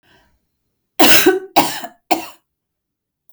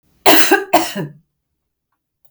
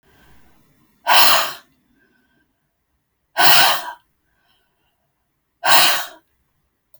{
  "three_cough_length": "3.3 s",
  "three_cough_amplitude": 32768,
  "three_cough_signal_mean_std_ratio": 0.35,
  "cough_length": "2.3 s",
  "cough_amplitude": 32768,
  "cough_signal_mean_std_ratio": 0.4,
  "exhalation_length": "7.0 s",
  "exhalation_amplitude": 32768,
  "exhalation_signal_mean_std_ratio": 0.34,
  "survey_phase": "beta (2021-08-13 to 2022-03-07)",
  "age": "45-64",
  "gender": "Female",
  "wearing_mask": "No",
  "symptom_cough_any": true,
  "smoker_status": "Never smoked",
  "respiratory_condition_asthma": false,
  "respiratory_condition_other": false,
  "recruitment_source": "REACT",
  "submission_delay": "1 day",
  "covid_test_result": "Negative",
  "covid_test_method": "RT-qPCR"
}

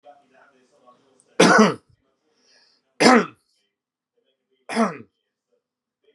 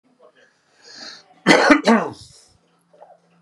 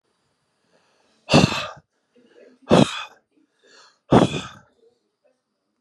{
  "three_cough_length": "6.1 s",
  "three_cough_amplitude": 32500,
  "three_cough_signal_mean_std_ratio": 0.27,
  "cough_length": "3.4 s",
  "cough_amplitude": 32768,
  "cough_signal_mean_std_ratio": 0.33,
  "exhalation_length": "5.8 s",
  "exhalation_amplitude": 30025,
  "exhalation_signal_mean_std_ratio": 0.27,
  "survey_phase": "beta (2021-08-13 to 2022-03-07)",
  "age": "45-64",
  "gender": "Male",
  "wearing_mask": "No",
  "symptom_cough_any": true,
  "symptom_shortness_of_breath": true,
  "symptom_fatigue": true,
  "symptom_onset": "12 days",
  "smoker_status": "Current smoker (11 or more cigarettes per day)",
  "respiratory_condition_asthma": false,
  "respiratory_condition_other": false,
  "recruitment_source": "REACT",
  "submission_delay": "1 day",
  "covid_test_result": "Negative",
  "covid_test_method": "RT-qPCR"
}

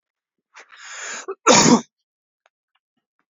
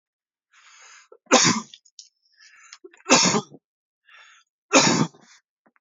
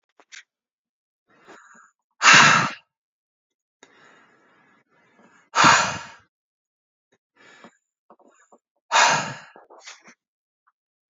{
  "cough_length": "3.3 s",
  "cough_amplitude": 29887,
  "cough_signal_mean_std_ratio": 0.29,
  "three_cough_length": "5.8 s",
  "three_cough_amplitude": 28636,
  "three_cough_signal_mean_std_ratio": 0.32,
  "exhalation_length": "11.1 s",
  "exhalation_amplitude": 29448,
  "exhalation_signal_mean_std_ratio": 0.26,
  "survey_phase": "beta (2021-08-13 to 2022-03-07)",
  "age": "18-44",
  "gender": "Male",
  "wearing_mask": "No",
  "symptom_none": true,
  "smoker_status": "Never smoked",
  "respiratory_condition_asthma": false,
  "respiratory_condition_other": false,
  "recruitment_source": "REACT",
  "submission_delay": "6 days",
  "covid_test_result": "Negative",
  "covid_test_method": "RT-qPCR"
}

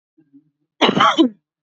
{
  "cough_length": "1.6 s",
  "cough_amplitude": 27713,
  "cough_signal_mean_std_ratio": 0.42,
  "survey_phase": "beta (2021-08-13 to 2022-03-07)",
  "age": "18-44",
  "gender": "Female",
  "wearing_mask": "No",
  "symptom_runny_or_blocked_nose": true,
  "symptom_headache": true,
  "symptom_onset": "3 days",
  "smoker_status": "Never smoked",
  "respiratory_condition_asthma": false,
  "respiratory_condition_other": false,
  "recruitment_source": "REACT",
  "submission_delay": "1 day",
  "covid_test_result": "Negative",
  "covid_test_method": "RT-qPCR",
  "influenza_a_test_result": "Negative",
  "influenza_b_test_result": "Negative"
}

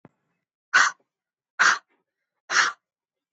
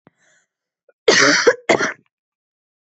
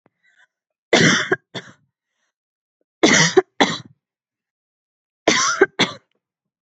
{
  "exhalation_length": "3.3 s",
  "exhalation_amplitude": 19718,
  "exhalation_signal_mean_std_ratio": 0.31,
  "cough_length": "2.8 s",
  "cough_amplitude": 29132,
  "cough_signal_mean_std_ratio": 0.38,
  "three_cough_length": "6.7 s",
  "three_cough_amplitude": 32768,
  "three_cough_signal_mean_std_ratio": 0.34,
  "survey_phase": "beta (2021-08-13 to 2022-03-07)",
  "age": "18-44",
  "gender": "Female",
  "wearing_mask": "No",
  "symptom_none": true,
  "smoker_status": "Never smoked",
  "respiratory_condition_asthma": false,
  "respiratory_condition_other": false,
  "recruitment_source": "REACT",
  "submission_delay": "3 days",
  "covid_test_result": "Negative",
  "covid_test_method": "RT-qPCR",
  "influenza_a_test_result": "Negative",
  "influenza_b_test_result": "Negative"
}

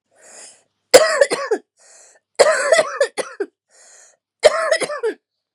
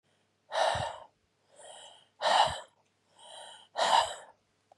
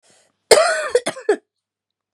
{
  "three_cough_length": "5.5 s",
  "three_cough_amplitude": 32768,
  "three_cough_signal_mean_std_ratio": 0.41,
  "exhalation_length": "4.8 s",
  "exhalation_amplitude": 8544,
  "exhalation_signal_mean_std_ratio": 0.4,
  "cough_length": "2.1 s",
  "cough_amplitude": 32768,
  "cough_signal_mean_std_ratio": 0.38,
  "survey_phase": "beta (2021-08-13 to 2022-03-07)",
  "age": "45-64",
  "gender": "Female",
  "wearing_mask": "No",
  "symptom_runny_or_blocked_nose": true,
  "symptom_sore_throat": true,
  "symptom_headache": true,
  "symptom_onset": "4 days",
  "smoker_status": "Never smoked",
  "respiratory_condition_asthma": true,
  "respiratory_condition_other": false,
  "recruitment_source": "Test and Trace",
  "submission_delay": "1 day",
  "covid_test_result": "Positive",
  "covid_test_method": "ePCR"
}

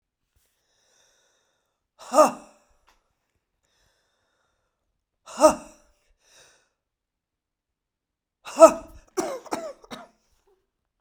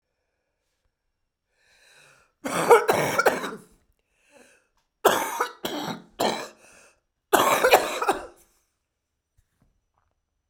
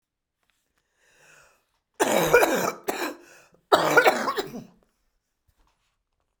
{
  "exhalation_length": "11.0 s",
  "exhalation_amplitude": 32768,
  "exhalation_signal_mean_std_ratio": 0.17,
  "three_cough_length": "10.5 s",
  "three_cough_amplitude": 29672,
  "three_cough_signal_mean_std_ratio": 0.35,
  "cough_length": "6.4 s",
  "cough_amplitude": 29350,
  "cough_signal_mean_std_ratio": 0.37,
  "survey_phase": "beta (2021-08-13 to 2022-03-07)",
  "age": "65+",
  "gender": "Female",
  "wearing_mask": "No",
  "symptom_cough_any": true,
  "symptom_new_continuous_cough": true,
  "symptom_runny_or_blocked_nose": true,
  "symptom_shortness_of_breath": true,
  "symptom_sore_throat": true,
  "symptom_onset": "4 days",
  "smoker_status": "Ex-smoker",
  "respiratory_condition_asthma": true,
  "respiratory_condition_other": false,
  "recruitment_source": "Test and Trace",
  "submission_delay": "1 day",
  "covid_test_result": "Positive",
  "covid_test_method": "RT-qPCR",
  "covid_ct_value": 16.2,
  "covid_ct_gene": "ORF1ab gene",
  "covid_ct_mean": 16.4,
  "covid_viral_load": "4000000 copies/ml",
  "covid_viral_load_category": "High viral load (>1M copies/ml)"
}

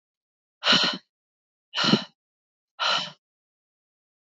{
  "exhalation_length": "4.3 s",
  "exhalation_amplitude": 17925,
  "exhalation_signal_mean_std_ratio": 0.34,
  "survey_phase": "alpha (2021-03-01 to 2021-08-12)",
  "age": "18-44",
  "gender": "Female",
  "wearing_mask": "No",
  "symptom_cough_any": true,
  "symptom_new_continuous_cough": true,
  "symptom_abdominal_pain": true,
  "symptom_diarrhoea": true,
  "symptom_fatigue": true,
  "symptom_fever_high_temperature": true,
  "symptom_headache": true,
  "symptom_onset": "3 days",
  "smoker_status": "Never smoked",
  "respiratory_condition_asthma": false,
  "respiratory_condition_other": false,
  "recruitment_source": "Test and Trace",
  "submission_delay": "1 day",
  "covid_test_result": "Positive",
  "covid_test_method": "RT-qPCR",
  "covid_ct_value": 15.2,
  "covid_ct_gene": "ORF1ab gene",
  "covid_ct_mean": 15.5,
  "covid_viral_load": "8400000 copies/ml",
  "covid_viral_load_category": "High viral load (>1M copies/ml)"
}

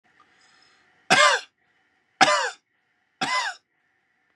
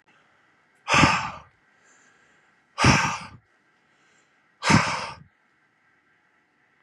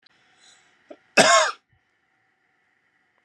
{
  "three_cough_length": "4.4 s",
  "three_cough_amplitude": 29378,
  "three_cough_signal_mean_std_ratio": 0.33,
  "exhalation_length": "6.8 s",
  "exhalation_amplitude": 21223,
  "exhalation_signal_mean_std_ratio": 0.32,
  "cough_length": "3.2 s",
  "cough_amplitude": 29203,
  "cough_signal_mean_std_ratio": 0.26,
  "survey_phase": "beta (2021-08-13 to 2022-03-07)",
  "age": "18-44",
  "gender": "Male",
  "wearing_mask": "No",
  "symptom_none": true,
  "smoker_status": "Never smoked",
  "respiratory_condition_asthma": false,
  "respiratory_condition_other": false,
  "recruitment_source": "REACT",
  "submission_delay": "1 day",
  "covid_test_result": "Negative",
  "covid_test_method": "RT-qPCR",
  "influenza_a_test_result": "Negative",
  "influenza_b_test_result": "Negative"
}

